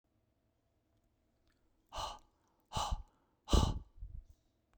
{"exhalation_length": "4.8 s", "exhalation_amplitude": 6022, "exhalation_signal_mean_std_ratio": 0.28, "survey_phase": "beta (2021-08-13 to 2022-03-07)", "age": "45-64", "gender": "Male", "wearing_mask": "No", "symptom_cough_any": true, "smoker_status": "Never smoked", "respiratory_condition_asthma": false, "respiratory_condition_other": false, "recruitment_source": "REACT", "submission_delay": "1 day", "covid_test_result": "Negative", "covid_test_method": "RT-qPCR", "influenza_a_test_result": "Negative", "influenza_b_test_result": "Negative"}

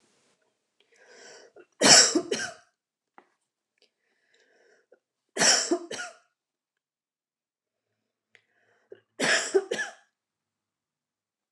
{"three_cough_length": "11.5 s", "three_cough_amplitude": 24597, "three_cough_signal_mean_std_ratio": 0.26, "survey_phase": "beta (2021-08-13 to 2022-03-07)", "age": "45-64", "gender": "Female", "wearing_mask": "No", "symptom_none": true, "smoker_status": "Ex-smoker", "respiratory_condition_asthma": false, "respiratory_condition_other": false, "recruitment_source": "REACT", "submission_delay": "5 days", "covid_test_result": "Negative", "covid_test_method": "RT-qPCR", "influenza_a_test_result": "Negative", "influenza_b_test_result": "Negative"}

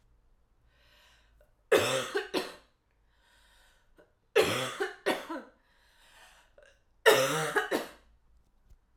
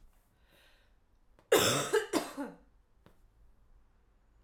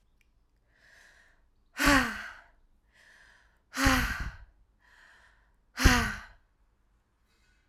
{"three_cough_length": "9.0 s", "three_cough_amplitude": 12787, "three_cough_signal_mean_std_ratio": 0.36, "cough_length": "4.4 s", "cough_amplitude": 8562, "cough_signal_mean_std_ratio": 0.33, "exhalation_length": "7.7 s", "exhalation_amplitude": 19062, "exhalation_signal_mean_std_ratio": 0.31, "survey_phase": "alpha (2021-03-01 to 2021-08-12)", "age": "18-44", "gender": "Female", "wearing_mask": "No", "symptom_cough_any": true, "symptom_headache": true, "symptom_change_to_sense_of_smell_or_taste": true, "symptom_onset": "3 days", "smoker_status": "Never smoked", "respiratory_condition_asthma": true, "respiratory_condition_other": false, "recruitment_source": "Test and Trace", "submission_delay": "2 days", "covid_test_result": "Positive", "covid_test_method": "RT-qPCR"}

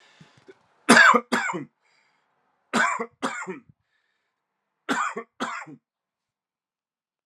{"three_cough_length": "7.3 s", "three_cough_amplitude": 30697, "three_cough_signal_mean_std_ratio": 0.3, "survey_phase": "alpha (2021-03-01 to 2021-08-12)", "age": "18-44", "gender": "Male", "wearing_mask": "No", "symptom_cough_any": true, "symptom_fatigue": true, "symptom_headache": true, "smoker_status": "Never smoked", "respiratory_condition_asthma": false, "respiratory_condition_other": false, "recruitment_source": "Test and Trace", "submission_delay": "2 days", "covid_test_result": "Positive", "covid_test_method": "RT-qPCR", "covid_ct_value": 14.7, "covid_ct_gene": "ORF1ab gene", "covid_ct_mean": 14.9, "covid_viral_load": "13000000 copies/ml", "covid_viral_load_category": "High viral load (>1M copies/ml)"}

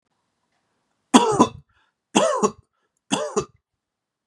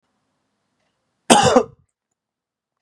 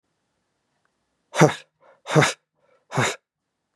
{"three_cough_length": "4.3 s", "three_cough_amplitude": 32767, "three_cough_signal_mean_std_ratio": 0.33, "cough_length": "2.8 s", "cough_amplitude": 32768, "cough_signal_mean_std_ratio": 0.26, "exhalation_length": "3.8 s", "exhalation_amplitude": 31592, "exhalation_signal_mean_std_ratio": 0.28, "survey_phase": "beta (2021-08-13 to 2022-03-07)", "age": "18-44", "gender": "Male", "wearing_mask": "No", "symptom_none": true, "smoker_status": "Ex-smoker", "respiratory_condition_asthma": false, "respiratory_condition_other": false, "recruitment_source": "Test and Trace", "submission_delay": "1 day", "covid_test_result": "Positive", "covid_test_method": "RT-qPCR", "covid_ct_value": 20.7, "covid_ct_gene": "ORF1ab gene", "covid_ct_mean": 21.6, "covid_viral_load": "82000 copies/ml", "covid_viral_load_category": "Low viral load (10K-1M copies/ml)"}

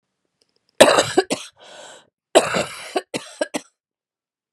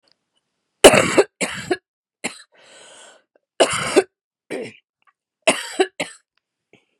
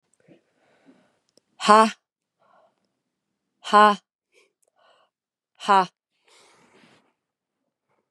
{"cough_length": "4.5 s", "cough_amplitude": 32768, "cough_signal_mean_std_ratio": 0.31, "three_cough_length": "7.0 s", "three_cough_amplitude": 32768, "three_cough_signal_mean_std_ratio": 0.29, "exhalation_length": "8.1 s", "exhalation_amplitude": 32236, "exhalation_signal_mean_std_ratio": 0.21, "survey_phase": "beta (2021-08-13 to 2022-03-07)", "age": "45-64", "gender": "Female", "wearing_mask": "No", "symptom_cough_any": true, "symptom_runny_or_blocked_nose": true, "symptom_sore_throat": true, "symptom_headache": true, "symptom_change_to_sense_of_smell_or_taste": true, "symptom_loss_of_taste": true, "symptom_onset": "2 days", "smoker_status": "Never smoked", "respiratory_condition_asthma": false, "respiratory_condition_other": false, "recruitment_source": "REACT", "submission_delay": "3 days", "covid_test_result": "Positive", "covid_test_method": "RT-qPCR", "covid_ct_value": 27.0, "covid_ct_gene": "E gene", "influenza_a_test_result": "Negative", "influenza_b_test_result": "Negative"}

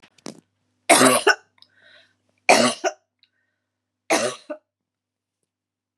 {"three_cough_length": "6.0 s", "three_cough_amplitude": 32767, "three_cough_signal_mean_std_ratio": 0.3, "survey_phase": "beta (2021-08-13 to 2022-03-07)", "age": "45-64", "gender": "Female", "wearing_mask": "No", "symptom_cough_any": true, "symptom_runny_or_blocked_nose": true, "symptom_sore_throat": true, "symptom_headache": true, "symptom_other": true, "symptom_onset": "2 days", "smoker_status": "Never smoked", "respiratory_condition_asthma": false, "respiratory_condition_other": false, "recruitment_source": "Test and Trace", "submission_delay": "1 day", "covid_test_result": "Negative", "covid_test_method": "RT-qPCR"}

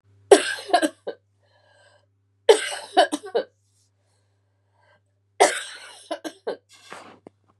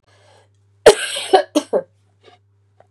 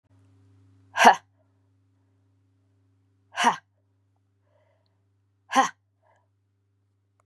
{"three_cough_length": "7.6 s", "three_cough_amplitude": 32767, "three_cough_signal_mean_std_ratio": 0.27, "cough_length": "2.9 s", "cough_amplitude": 32768, "cough_signal_mean_std_ratio": 0.29, "exhalation_length": "7.3 s", "exhalation_amplitude": 31407, "exhalation_signal_mean_std_ratio": 0.19, "survey_phase": "beta (2021-08-13 to 2022-03-07)", "age": "45-64", "gender": "Female", "wearing_mask": "No", "symptom_cough_any": true, "symptom_runny_or_blocked_nose": true, "symptom_sore_throat": true, "symptom_headache": true, "symptom_onset": "2 days", "smoker_status": "Never smoked", "respiratory_condition_asthma": false, "respiratory_condition_other": false, "recruitment_source": "Test and Trace", "submission_delay": "2 days", "covid_test_result": "Positive", "covid_test_method": "RT-qPCR", "covid_ct_value": 22.9, "covid_ct_gene": "ORF1ab gene"}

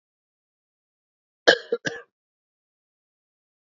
{"cough_length": "3.8 s", "cough_amplitude": 30505, "cough_signal_mean_std_ratio": 0.16, "survey_phase": "beta (2021-08-13 to 2022-03-07)", "age": "45-64", "gender": "Male", "wearing_mask": "No", "symptom_cough_any": true, "symptom_new_continuous_cough": true, "symptom_runny_or_blocked_nose": true, "symptom_fatigue": true, "symptom_headache": true, "symptom_change_to_sense_of_smell_or_taste": true, "symptom_loss_of_taste": true, "symptom_other": true, "symptom_onset": "4 days", "smoker_status": "Ex-smoker", "respiratory_condition_asthma": false, "respiratory_condition_other": false, "recruitment_source": "Test and Trace", "submission_delay": "2 days", "covid_test_result": "Positive", "covid_test_method": "RT-qPCR", "covid_ct_value": 17.3, "covid_ct_gene": "ORF1ab gene", "covid_ct_mean": 17.8, "covid_viral_load": "1400000 copies/ml", "covid_viral_load_category": "High viral load (>1M copies/ml)"}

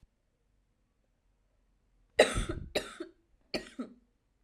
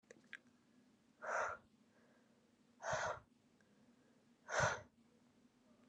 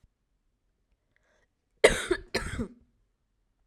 {"three_cough_length": "4.4 s", "three_cough_amplitude": 15880, "three_cough_signal_mean_std_ratio": 0.25, "exhalation_length": "5.9 s", "exhalation_amplitude": 2063, "exhalation_signal_mean_std_ratio": 0.36, "cough_length": "3.7 s", "cough_amplitude": 26671, "cough_signal_mean_std_ratio": 0.23, "survey_phase": "alpha (2021-03-01 to 2021-08-12)", "age": "18-44", "gender": "Female", "wearing_mask": "No", "symptom_cough_any": true, "symptom_new_continuous_cough": true, "symptom_onset": "4 days", "smoker_status": "Never smoked", "respiratory_condition_asthma": false, "respiratory_condition_other": false, "recruitment_source": "Test and Trace", "submission_delay": "2 days", "covid_test_result": "Positive", "covid_test_method": "RT-qPCR", "covid_ct_value": 14.9, "covid_ct_gene": "S gene", "covid_ct_mean": 15.1, "covid_viral_load": "11000000 copies/ml", "covid_viral_load_category": "High viral load (>1M copies/ml)"}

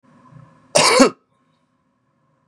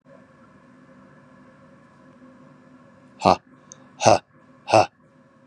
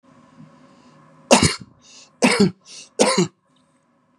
{"cough_length": "2.5 s", "cough_amplitude": 32767, "cough_signal_mean_std_ratio": 0.31, "exhalation_length": "5.5 s", "exhalation_amplitude": 31488, "exhalation_signal_mean_std_ratio": 0.23, "three_cough_length": "4.2 s", "three_cough_amplitude": 32767, "three_cough_signal_mean_std_ratio": 0.34, "survey_phase": "beta (2021-08-13 to 2022-03-07)", "age": "45-64", "gender": "Male", "wearing_mask": "No", "symptom_headache": true, "smoker_status": "Never smoked", "respiratory_condition_asthma": false, "respiratory_condition_other": false, "recruitment_source": "REACT", "submission_delay": "0 days", "covid_test_result": "Negative", "covid_test_method": "RT-qPCR", "influenza_a_test_result": "Negative", "influenza_b_test_result": "Negative"}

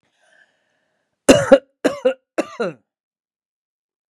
{"three_cough_length": "4.1 s", "three_cough_amplitude": 32768, "three_cough_signal_mean_std_ratio": 0.26, "survey_phase": "beta (2021-08-13 to 2022-03-07)", "age": "45-64", "gender": "Female", "wearing_mask": "No", "symptom_none": true, "smoker_status": "Ex-smoker", "respiratory_condition_asthma": false, "respiratory_condition_other": false, "recruitment_source": "REACT", "submission_delay": "3 days", "covid_test_result": "Negative", "covid_test_method": "RT-qPCR", "influenza_a_test_result": "Negative", "influenza_b_test_result": "Negative"}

